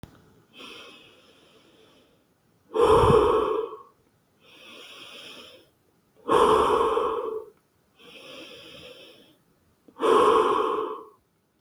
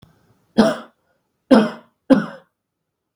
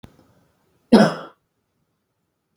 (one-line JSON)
{"exhalation_length": "11.6 s", "exhalation_amplitude": 15837, "exhalation_signal_mean_std_ratio": 0.44, "three_cough_length": "3.2 s", "three_cough_amplitude": 32768, "three_cough_signal_mean_std_ratio": 0.31, "cough_length": "2.6 s", "cough_amplitude": 32768, "cough_signal_mean_std_ratio": 0.22, "survey_phase": "beta (2021-08-13 to 2022-03-07)", "age": "18-44", "gender": "Male", "wearing_mask": "No", "symptom_none": true, "smoker_status": "Never smoked", "respiratory_condition_asthma": false, "respiratory_condition_other": false, "recruitment_source": "REACT", "submission_delay": "2 days", "covid_test_result": "Negative", "covid_test_method": "RT-qPCR"}